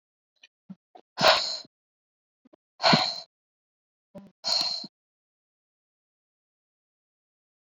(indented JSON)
{
  "exhalation_length": "7.7 s",
  "exhalation_amplitude": 20690,
  "exhalation_signal_mean_std_ratio": 0.26,
  "survey_phase": "beta (2021-08-13 to 2022-03-07)",
  "age": "18-44",
  "gender": "Female",
  "wearing_mask": "No",
  "symptom_cough_any": true,
  "symptom_runny_or_blocked_nose": true,
  "symptom_shortness_of_breath": true,
  "symptom_sore_throat": true,
  "symptom_abdominal_pain": true,
  "symptom_fatigue": true,
  "symptom_fever_high_temperature": true,
  "symptom_headache": true,
  "symptom_change_to_sense_of_smell_or_taste": true,
  "symptom_loss_of_taste": true,
  "symptom_onset": "6 days",
  "smoker_status": "Never smoked",
  "respiratory_condition_asthma": false,
  "respiratory_condition_other": false,
  "recruitment_source": "Test and Trace",
  "submission_delay": "1 day",
  "covid_test_result": "Positive",
  "covid_test_method": "RT-qPCR",
  "covid_ct_value": 19.9,
  "covid_ct_gene": "ORF1ab gene",
  "covid_ct_mean": 20.2,
  "covid_viral_load": "240000 copies/ml",
  "covid_viral_load_category": "Low viral load (10K-1M copies/ml)"
}